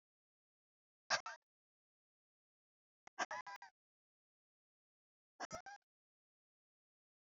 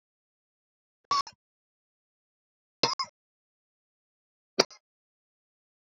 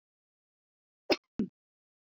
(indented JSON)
{
  "exhalation_length": "7.3 s",
  "exhalation_amplitude": 1909,
  "exhalation_signal_mean_std_ratio": 0.19,
  "three_cough_length": "5.8 s",
  "three_cough_amplitude": 23514,
  "three_cough_signal_mean_std_ratio": 0.16,
  "cough_length": "2.1 s",
  "cough_amplitude": 7571,
  "cough_signal_mean_std_ratio": 0.18,
  "survey_phase": "alpha (2021-03-01 to 2021-08-12)",
  "age": "18-44",
  "gender": "Female",
  "wearing_mask": "No",
  "symptom_headache": true,
  "smoker_status": "Never smoked",
  "respiratory_condition_asthma": true,
  "respiratory_condition_other": false,
  "recruitment_source": "REACT",
  "submission_delay": "1 day",
  "covid_test_result": "Negative",
  "covid_test_method": "RT-qPCR"
}